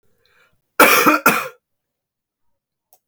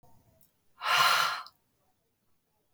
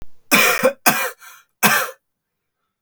{"cough_length": "3.1 s", "cough_amplitude": 32768, "cough_signal_mean_std_ratio": 0.34, "exhalation_length": "2.7 s", "exhalation_amplitude": 8818, "exhalation_signal_mean_std_ratio": 0.38, "three_cough_length": "2.8 s", "three_cough_amplitude": 32768, "three_cough_signal_mean_std_ratio": 0.47, "survey_phase": "alpha (2021-03-01 to 2021-08-12)", "age": "18-44", "gender": "Male", "wearing_mask": "No", "symptom_none": true, "smoker_status": "Prefer not to say", "respiratory_condition_asthma": false, "respiratory_condition_other": false, "recruitment_source": "REACT", "submission_delay": "5 days", "covid_test_result": "Negative", "covid_test_method": "RT-qPCR"}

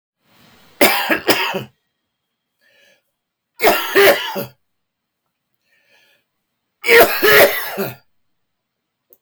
{"three_cough_length": "9.2 s", "three_cough_amplitude": 32768, "three_cough_signal_mean_std_ratio": 0.38, "survey_phase": "beta (2021-08-13 to 2022-03-07)", "age": "65+", "gender": "Male", "wearing_mask": "No", "symptom_cough_any": true, "symptom_shortness_of_breath": true, "symptom_onset": "8 days", "smoker_status": "Ex-smoker", "respiratory_condition_asthma": false, "respiratory_condition_other": true, "recruitment_source": "REACT", "submission_delay": "2 days", "covid_test_result": "Negative", "covid_test_method": "RT-qPCR", "influenza_a_test_result": "Negative", "influenza_b_test_result": "Negative"}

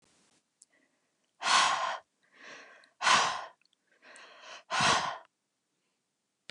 {"exhalation_length": "6.5 s", "exhalation_amplitude": 8845, "exhalation_signal_mean_std_ratio": 0.38, "survey_phase": "beta (2021-08-13 to 2022-03-07)", "age": "18-44", "gender": "Female", "wearing_mask": "No", "symptom_none": true, "smoker_status": "Never smoked", "respiratory_condition_asthma": false, "respiratory_condition_other": false, "recruitment_source": "REACT", "submission_delay": "1 day", "covid_test_result": "Negative", "covid_test_method": "RT-qPCR", "influenza_a_test_result": "Negative", "influenza_b_test_result": "Negative"}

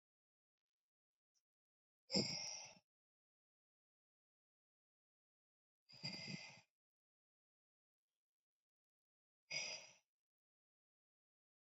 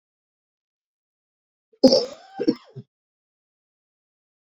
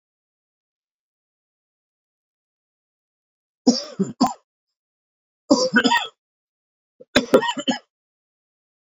{"exhalation_length": "11.6 s", "exhalation_amplitude": 2062, "exhalation_signal_mean_std_ratio": 0.24, "cough_length": "4.5 s", "cough_amplitude": 26375, "cough_signal_mean_std_ratio": 0.2, "three_cough_length": "9.0 s", "three_cough_amplitude": 32767, "three_cough_signal_mean_std_ratio": 0.27, "survey_phase": "beta (2021-08-13 to 2022-03-07)", "age": "45-64", "gender": "Male", "wearing_mask": "No", "symptom_cough_any": true, "symptom_new_continuous_cough": true, "symptom_runny_or_blocked_nose": true, "symptom_shortness_of_breath": true, "symptom_sore_throat": true, "symptom_fatigue": true, "symptom_fever_high_temperature": true, "symptom_headache": true, "symptom_change_to_sense_of_smell_or_taste": true, "symptom_loss_of_taste": true, "smoker_status": "Never smoked", "respiratory_condition_asthma": false, "respiratory_condition_other": false, "recruitment_source": "Test and Trace", "submission_delay": "1 day", "covid_test_result": "Positive", "covid_test_method": "LFT"}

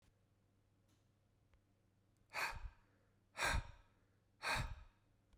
{"exhalation_length": "5.4 s", "exhalation_amplitude": 1585, "exhalation_signal_mean_std_ratio": 0.36, "survey_phase": "beta (2021-08-13 to 2022-03-07)", "age": "45-64", "gender": "Male", "wearing_mask": "No", "symptom_cough_any": true, "symptom_shortness_of_breath": true, "smoker_status": "Ex-smoker", "respiratory_condition_asthma": false, "respiratory_condition_other": false, "recruitment_source": "Test and Trace", "submission_delay": "0 days", "covid_test_result": "Positive", "covid_test_method": "RT-qPCR", "covid_ct_value": 26.6, "covid_ct_gene": "N gene", "covid_ct_mean": 27.2, "covid_viral_load": "1200 copies/ml", "covid_viral_load_category": "Minimal viral load (< 10K copies/ml)"}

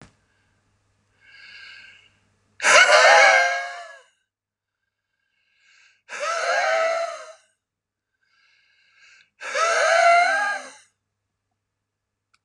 {"exhalation_length": "12.4 s", "exhalation_amplitude": 28316, "exhalation_signal_mean_std_ratio": 0.4, "survey_phase": "beta (2021-08-13 to 2022-03-07)", "age": "65+", "gender": "Male", "wearing_mask": "No", "symptom_none": true, "smoker_status": "Never smoked", "respiratory_condition_asthma": false, "respiratory_condition_other": false, "recruitment_source": "REACT", "submission_delay": "1 day", "covid_test_result": "Negative", "covid_test_method": "RT-qPCR", "influenza_a_test_result": "Negative", "influenza_b_test_result": "Negative"}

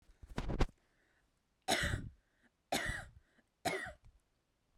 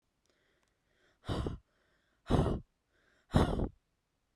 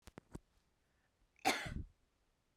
{"three_cough_length": "4.8 s", "three_cough_amplitude": 4198, "three_cough_signal_mean_std_ratio": 0.4, "exhalation_length": "4.4 s", "exhalation_amplitude": 6984, "exhalation_signal_mean_std_ratio": 0.35, "cough_length": "2.6 s", "cough_amplitude": 2905, "cough_signal_mean_std_ratio": 0.28, "survey_phase": "beta (2021-08-13 to 2022-03-07)", "age": "18-44", "gender": "Female", "wearing_mask": "No", "symptom_none": true, "smoker_status": "Never smoked", "respiratory_condition_asthma": false, "respiratory_condition_other": false, "recruitment_source": "REACT", "submission_delay": "14 days", "covid_test_result": "Negative", "covid_test_method": "RT-qPCR"}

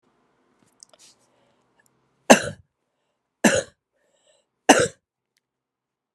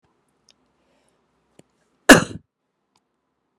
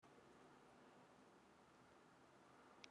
{"three_cough_length": "6.1 s", "three_cough_amplitude": 32768, "three_cough_signal_mean_std_ratio": 0.19, "cough_length": "3.6 s", "cough_amplitude": 32768, "cough_signal_mean_std_ratio": 0.14, "exhalation_length": "2.9 s", "exhalation_amplitude": 501, "exhalation_signal_mean_std_ratio": 1.12, "survey_phase": "beta (2021-08-13 to 2022-03-07)", "age": "45-64", "gender": "Female", "wearing_mask": "No", "symptom_runny_or_blocked_nose": true, "symptom_sore_throat": true, "smoker_status": "Ex-smoker", "respiratory_condition_asthma": false, "respiratory_condition_other": false, "recruitment_source": "Test and Trace", "submission_delay": "2 days", "covid_test_result": "Positive", "covid_test_method": "RT-qPCR", "covid_ct_value": 13.4, "covid_ct_gene": "ORF1ab gene", "covid_ct_mean": 14.2, "covid_viral_load": "23000000 copies/ml", "covid_viral_load_category": "High viral load (>1M copies/ml)"}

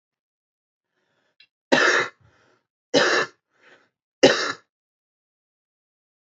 {"three_cough_length": "6.4 s", "three_cough_amplitude": 27341, "three_cough_signal_mean_std_ratio": 0.29, "survey_phase": "alpha (2021-03-01 to 2021-08-12)", "age": "18-44", "gender": "Male", "wearing_mask": "No", "symptom_none": true, "smoker_status": "Never smoked", "respiratory_condition_asthma": false, "respiratory_condition_other": false, "recruitment_source": "REACT", "submission_delay": "1 day", "covid_test_result": "Negative", "covid_test_method": "RT-qPCR"}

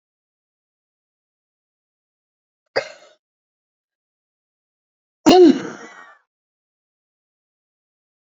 {"cough_length": "8.3 s", "cough_amplitude": 30929, "cough_signal_mean_std_ratio": 0.18, "survey_phase": "beta (2021-08-13 to 2022-03-07)", "age": "65+", "gender": "Female", "wearing_mask": "No", "symptom_cough_any": true, "symptom_onset": "12 days", "smoker_status": "Never smoked", "respiratory_condition_asthma": true, "respiratory_condition_other": false, "recruitment_source": "REACT", "submission_delay": "2 days", "covid_test_result": "Negative", "covid_test_method": "RT-qPCR", "influenza_a_test_result": "Unknown/Void", "influenza_b_test_result": "Unknown/Void"}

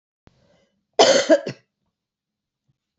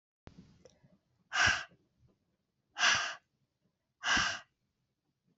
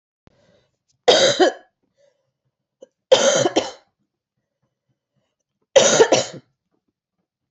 {"cough_length": "3.0 s", "cough_amplitude": 27619, "cough_signal_mean_std_ratio": 0.28, "exhalation_length": "5.4 s", "exhalation_amplitude": 6091, "exhalation_signal_mean_std_ratio": 0.34, "three_cough_length": "7.5 s", "three_cough_amplitude": 28549, "three_cough_signal_mean_std_ratio": 0.33, "survey_phase": "beta (2021-08-13 to 2022-03-07)", "age": "45-64", "gender": "Female", "wearing_mask": "No", "symptom_cough_any": true, "symptom_new_continuous_cough": true, "symptom_runny_or_blocked_nose": true, "symptom_fatigue": true, "symptom_other": true, "symptom_onset": "3 days", "smoker_status": "Never smoked", "respiratory_condition_asthma": false, "respiratory_condition_other": false, "recruitment_source": "Test and Trace", "submission_delay": "1 day", "covid_test_result": "Negative", "covid_test_method": "RT-qPCR"}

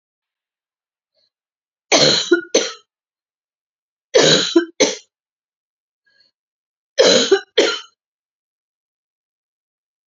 {"three_cough_length": "10.1 s", "three_cough_amplitude": 31103, "three_cough_signal_mean_std_ratio": 0.32, "survey_phase": "beta (2021-08-13 to 2022-03-07)", "age": "45-64", "gender": "Female", "wearing_mask": "No", "symptom_cough_any": true, "symptom_runny_or_blocked_nose": true, "symptom_fatigue": true, "symptom_headache": true, "symptom_change_to_sense_of_smell_or_taste": true, "symptom_other": true, "symptom_onset": "12 days", "smoker_status": "Never smoked", "respiratory_condition_asthma": false, "respiratory_condition_other": false, "recruitment_source": "REACT", "submission_delay": "0 days", "covid_test_result": "Positive", "covid_test_method": "RT-qPCR", "covid_ct_value": 26.0, "covid_ct_gene": "E gene", "influenza_a_test_result": "Negative", "influenza_b_test_result": "Negative"}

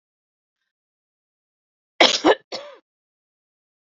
{"cough_length": "3.8 s", "cough_amplitude": 30704, "cough_signal_mean_std_ratio": 0.21, "survey_phase": "beta (2021-08-13 to 2022-03-07)", "age": "45-64", "gender": "Female", "wearing_mask": "No", "symptom_cough_any": true, "symptom_onset": "3 days", "smoker_status": "Never smoked", "respiratory_condition_asthma": true, "respiratory_condition_other": false, "recruitment_source": "Test and Trace", "submission_delay": "2 days", "covid_test_result": "Negative", "covid_test_method": "RT-qPCR"}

